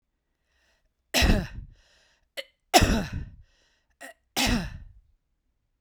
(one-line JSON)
{"three_cough_length": "5.8 s", "three_cough_amplitude": 25061, "three_cough_signal_mean_std_ratio": 0.34, "survey_phase": "beta (2021-08-13 to 2022-03-07)", "age": "45-64", "gender": "Female", "wearing_mask": "No", "symptom_none": true, "symptom_onset": "12 days", "smoker_status": "Current smoker (1 to 10 cigarettes per day)", "respiratory_condition_asthma": false, "respiratory_condition_other": false, "recruitment_source": "REACT", "submission_delay": "1 day", "covid_test_result": "Negative", "covid_test_method": "RT-qPCR"}